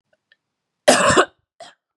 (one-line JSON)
{"cough_length": "2.0 s", "cough_amplitude": 32765, "cough_signal_mean_std_ratio": 0.35, "survey_phase": "beta (2021-08-13 to 2022-03-07)", "age": "45-64", "gender": "Female", "wearing_mask": "No", "symptom_cough_any": true, "symptom_runny_or_blocked_nose": true, "symptom_shortness_of_breath": true, "symptom_sore_throat": true, "symptom_fatigue": true, "symptom_onset": "3 days", "smoker_status": "Never smoked", "respiratory_condition_asthma": false, "respiratory_condition_other": false, "recruitment_source": "Test and Trace", "submission_delay": "2 days", "covid_test_result": "Positive", "covid_test_method": "RT-qPCR", "covid_ct_value": 20.5, "covid_ct_gene": "ORF1ab gene", "covid_ct_mean": 20.9, "covid_viral_load": "140000 copies/ml", "covid_viral_load_category": "Low viral load (10K-1M copies/ml)"}